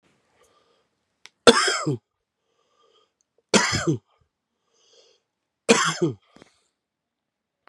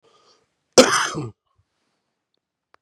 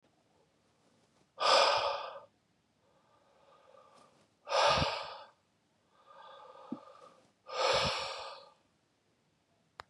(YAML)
three_cough_length: 7.7 s
three_cough_amplitude: 32768
three_cough_signal_mean_std_ratio: 0.27
cough_length: 2.8 s
cough_amplitude: 32768
cough_signal_mean_std_ratio: 0.24
exhalation_length: 9.9 s
exhalation_amplitude: 7420
exhalation_signal_mean_std_ratio: 0.37
survey_phase: beta (2021-08-13 to 2022-03-07)
age: 18-44
gender: Male
wearing_mask: 'No'
symptom_cough_any: true
symptom_fever_high_temperature: true
symptom_headache: true
symptom_onset: 4 days
smoker_status: Never smoked
respiratory_condition_asthma: false
respiratory_condition_other: false
recruitment_source: Test and Trace
submission_delay: 2 days
covid_test_result: Positive
covid_test_method: RT-qPCR
covid_ct_value: 27.6
covid_ct_gene: ORF1ab gene